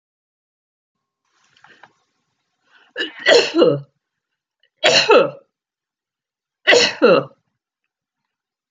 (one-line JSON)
{"three_cough_length": "8.7 s", "three_cough_amplitude": 32768, "three_cough_signal_mean_std_ratio": 0.33, "survey_phase": "beta (2021-08-13 to 2022-03-07)", "age": "65+", "gender": "Female", "wearing_mask": "No", "symptom_none": true, "smoker_status": "Never smoked", "respiratory_condition_asthma": false, "respiratory_condition_other": false, "recruitment_source": "REACT", "submission_delay": "2 days", "covid_test_result": "Negative", "covid_test_method": "RT-qPCR"}